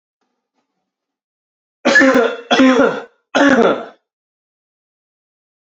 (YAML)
three_cough_length: 5.6 s
three_cough_amplitude: 31416
three_cough_signal_mean_std_ratio: 0.42
survey_phase: beta (2021-08-13 to 2022-03-07)
age: 18-44
gender: Male
wearing_mask: 'No'
symptom_cough_any: true
symptom_runny_or_blocked_nose: true
symptom_fatigue: true
symptom_change_to_sense_of_smell_or_taste: true
symptom_loss_of_taste: true
smoker_status: Never smoked
respiratory_condition_asthma: false
respiratory_condition_other: false
recruitment_source: Test and Trace
submission_delay: -1 day
covid_test_result: Positive
covid_test_method: LFT